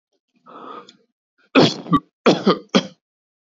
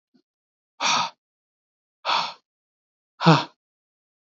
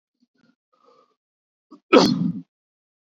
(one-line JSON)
{"three_cough_length": "3.5 s", "three_cough_amplitude": 28453, "three_cough_signal_mean_std_ratio": 0.34, "exhalation_length": "4.4 s", "exhalation_amplitude": 22565, "exhalation_signal_mean_std_ratio": 0.3, "cough_length": "3.2 s", "cough_amplitude": 27318, "cough_signal_mean_std_ratio": 0.26, "survey_phase": "beta (2021-08-13 to 2022-03-07)", "age": "18-44", "gender": "Male", "wearing_mask": "No", "symptom_none": true, "smoker_status": "Never smoked", "respiratory_condition_asthma": false, "respiratory_condition_other": false, "recruitment_source": "REACT", "submission_delay": "1 day", "covid_test_result": "Negative", "covid_test_method": "RT-qPCR", "influenza_a_test_result": "Negative", "influenza_b_test_result": "Negative"}